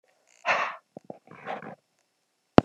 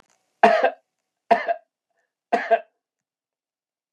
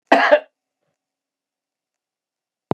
{"exhalation_length": "2.6 s", "exhalation_amplitude": 32768, "exhalation_signal_mean_std_ratio": 0.21, "three_cough_length": "3.9 s", "three_cough_amplitude": 30482, "three_cough_signal_mean_std_ratio": 0.3, "cough_length": "2.7 s", "cough_amplitude": 32589, "cough_signal_mean_std_ratio": 0.24, "survey_phase": "beta (2021-08-13 to 2022-03-07)", "age": "45-64", "gender": "Male", "wearing_mask": "No", "symptom_none": true, "smoker_status": "Ex-smoker", "respiratory_condition_asthma": false, "respiratory_condition_other": false, "recruitment_source": "REACT", "submission_delay": "2 days", "covid_test_result": "Negative", "covid_test_method": "RT-qPCR", "influenza_a_test_result": "Negative", "influenza_b_test_result": "Negative"}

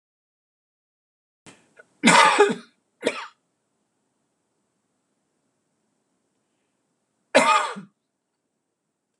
{"cough_length": "9.2 s", "cough_amplitude": 26028, "cough_signal_mean_std_ratio": 0.25, "survey_phase": "alpha (2021-03-01 to 2021-08-12)", "age": "65+", "gender": "Male", "wearing_mask": "No", "symptom_prefer_not_to_say": true, "smoker_status": "Never smoked", "respiratory_condition_asthma": false, "respiratory_condition_other": false, "recruitment_source": "Test and Trace", "submission_delay": "2 days", "covid_test_result": "Positive", "covid_test_method": "RT-qPCR", "covid_ct_value": 24.2, "covid_ct_gene": "ORF1ab gene", "covid_ct_mean": 24.6, "covid_viral_load": "8300 copies/ml", "covid_viral_load_category": "Minimal viral load (< 10K copies/ml)"}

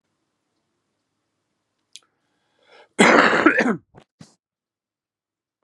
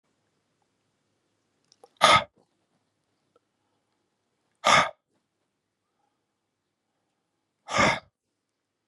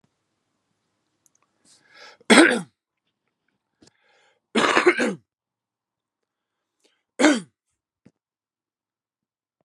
{"cough_length": "5.6 s", "cough_amplitude": 32692, "cough_signal_mean_std_ratio": 0.28, "exhalation_length": "8.9 s", "exhalation_amplitude": 31170, "exhalation_signal_mean_std_ratio": 0.21, "three_cough_length": "9.6 s", "three_cough_amplitude": 32755, "three_cough_signal_mean_std_ratio": 0.24, "survey_phase": "beta (2021-08-13 to 2022-03-07)", "age": "45-64", "gender": "Male", "wearing_mask": "No", "symptom_cough_any": true, "symptom_runny_or_blocked_nose": true, "symptom_shortness_of_breath": true, "symptom_fatigue": true, "symptom_headache": true, "symptom_onset": "4 days", "smoker_status": "Current smoker (11 or more cigarettes per day)", "respiratory_condition_asthma": false, "respiratory_condition_other": false, "recruitment_source": "Test and Trace", "submission_delay": "1 day", "covid_test_result": "Positive", "covid_test_method": "ePCR"}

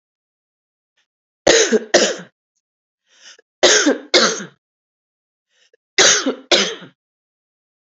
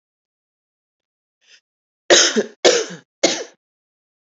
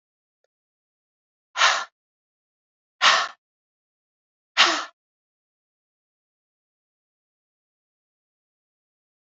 {"cough_length": "7.9 s", "cough_amplitude": 30453, "cough_signal_mean_std_ratio": 0.36, "three_cough_length": "4.3 s", "three_cough_amplitude": 31421, "three_cough_signal_mean_std_ratio": 0.3, "exhalation_length": "9.3 s", "exhalation_amplitude": 24846, "exhalation_signal_mean_std_ratio": 0.21, "survey_phase": "beta (2021-08-13 to 2022-03-07)", "age": "45-64", "gender": "Female", "wearing_mask": "No", "symptom_cough_any": true, "symptom_headache": true, "symptom_change_to_sense_of_smell_or_taste": true, "symptom_loss_of_taste": true, "symptom_onset": "10 days", "smoker_status": "Ex-smoker", "respiratory_condition_asthma": false, "respiratory_condition_other": false, "recruitment_source": "Test and Trace", "submission_delay": "8 days", "covid_test_result": "Positive", "covid_test_method": "RT-qPCR", "covid_ct_value": 17.4, "covid_ct_gene": "ORF1ab gene", "covid_ct_mean": 18.5, "covid_viral_load": "880000 copies/ml", "covid_viral_load_category": "Low viral load (10K-1M copies/ml)"}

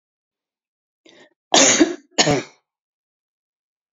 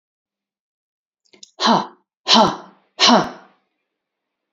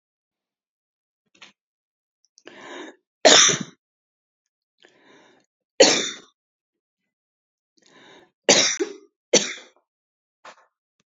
{"cough_length": "3.9 s", "cough_amplitude": 32282, "cough_signal_mean_std_ratio": 0.3, "exhalation_length": "4.5 s", "exhalation_amplitude": 32768, "exhalation_signal_mean_std_ratio": 0.33, "three_cough_length": "11.1 s", "three_cough_amplitude": 30932, "three_cough_signal_mean_std_ratio": 0.24, "survey_phase": "beta (2021-08-13 to 2022-03-07)", "age": "65+", "gender": "Female", "wearing_mask": "No", "symptom_none": true, "smoker_status": "Ex-smoker", "respiratory_condition_asthma": false, "respiratory_condition_other": false, "recruitment_source": "REACT", "submission_delay": "1 day", "covid_test_result": "Negative", "covid_test_method": "RT-qPCR"}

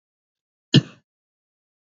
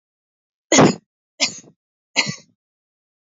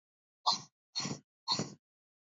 {"cough_length": "1.9 s", "cough_amplitude": 25926, "cough_signal_mean_std_ratio": 0.15, "three_cough_length": "3.2 s", "three_cough_amplitude": 32767, "three_cough_signal_mean_std_ratio": 0.27, "exhalation_length": "2.4 s", "exhalation_amplitude": 5146, "exhalation_signal_mean_std_ratio": 0.35, "survey_phase": "beta (2021-08-13 to 2022-03-07)", "age": "18-44", "gender": "Female", "wearing_mask": "No", "symptom_none": true, "smoker_status": "Never smoked", "respiratory_condition_asthma": false, "respiratory_condition_other": false, "recruitment_source": "REACT", "submission_delay": "1 day", "covid_test_result": "Negative", "covid_test_method": "RT-qPCR", "influenza_a_test_result": "Negative", "influenza_b_test_result": "Negative"}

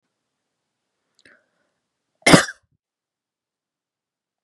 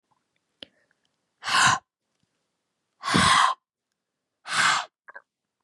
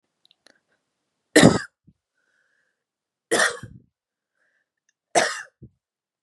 {"cough_length": "4.4 s", "cough_amplitude": 32768, "cough_signal_mean_std_ratio": 0.15, "exhalation_length": "5.6 s", "exhalation_amplitude": 16687, "exhalation_signal_mean_std_ratio": 0.36, "three_cough_length": "6.2 s", "three_cough_amplitude": 32767, "three_cough_signal_mean_std_ratio": 0.23, "survey_phase": "beta (2021-08-13 to 2022-03-07)", "age": "18-44", "gender": "Female", "wearing_mask": "No", "symptom_none": true, "smoker_status": "Never smoked", "respiratory_condition_asthma": false, "respiratory_condition_other": false, "recruitment_source": "REACT", "submission_delay": "5 days", "covid_test_result": "Negative", "covid_test_method": "RT-qPCR", "influenza_a_test_result": "Negative", "influenza_b_test_result": "Negative"}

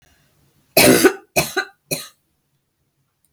{"cough_length": "3.3 s", "cough_amplitude": 32767, "cough_signal_mean_std_ratio": 0.32, "survey_phase": "beta (2021-08-13 to 2022-03-07)", "age": "65+", "gender": "Female", "wearing_mask": "No", "symptom_none": true, "smoker_status": "Never smoked", "respiratory_condition_asthma": false, "respiratory_condition_other": false, "recruitment_source": "REACT", "submission_delay": "6 days", "covid_test_result": "Negative", "covid_test_method": "RT-qPCR"}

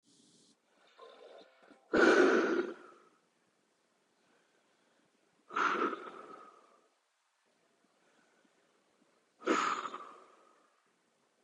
{"exhalation_length": "11.4 s", "exhalation_amplitude": 6624, "exhalation_signal_mean_std_ratio": 0.31, "survey_phase": "beta (2021-08-13 to 2022-03-07)", "age": "18-44", "gender": "Male", "wearing_mask": "No", "symptom_cough_any": true, "symptom_runny_or_blocked_nose": true, "smoker_status": "Prefer not to say", "respiratory_condition_asthma": false, "respiratory_condition_other": false, "recruitment_source": "Test and Trace", "submission_delay": "2 days", "covid_test_result": "Positive", "covid_test_method": "RT-qPCR", "covid_ct_value": 17.7, "covid_ct_gene": "ORF1ab gene", "covid_ct_mean": 18.7, "covid_viral_load": "750000 copies/ml", "covid_viral_load_category": "Low viral load (10K-1M copies/ml)"}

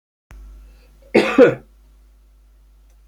{"cough_length": "3.1 s", "cough_amplitude": 31891, "cough_signal_mean_std_ratio": 0.28, "survey_phase": "alpha (2021-03-01 to 2021-08-12)", "age": "65+", "gender": "Male", "wearing_mask": "No", "symptom_none": true, "smoker_status": "Ex-smoker", "respiratory_condition_asthma": false, "respiratory_condition_other": false, "recruitment_source": "REACT", "submission_delay": "1 day", "covid_test_result": "Negative", "covid_test_method": "RT-qPCR"}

